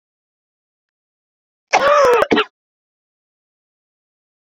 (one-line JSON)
{"cough_length": "4.4 s", "cough_amplitude": 32767, "cough_signal_mean_std_ratio": 0.32, "survey_phase": "beta (2021-08-13 to 2022-03-07)", "age": "45-64", "gender": "Female", "wearing_mask": "No", "symptom_cough_any": true, "symptom_new_continuous_cough": true, "symptom_runny_or_blocked_nose": true, "symptom_shortness_of_breath": true, "symptom_fatigue": true, "symptom_change_to_sense_of_smell_or_taste": true, "symptom_loss_of_taste": true, "symptom_onset": "5 days", "smoker_status": "Never smoked", "respiratory_condition_asthma": false, "respiratory_condition_other": false, "recruitment_source": "Test and Trace", "submission_delay": "2 days", "covid_test_result": "Positive", "covid_test_method": "RT-qPCR", "covid_ct_value": 15.2, "covid_ct_gene": "S gene", "covid_ct_mean": 15.6, "covid_viral_load": "7600000 copies/ml", "covid_viral_load_category": "High viral load (>1M copies/ml)"}